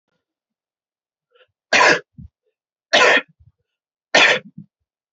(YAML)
three_cough_length: 5.1 s
three_cough_amplitude: 28822
three_cough_signal_mean_std_ratio: 0.32
survey_phase: alpha (2021-03-01 to 2021-08-12)
age: 45-64
gender: Male
wearing_mask: 'No'
symptom_none: true
smoker_status: Never smoked
respiratory_condition_asthma: false
respiratory_condition_other: false
recruitment_source: REACT
submission_delay: 1 day
covid_test_result: Negative
covid_test_method: RT-qPCR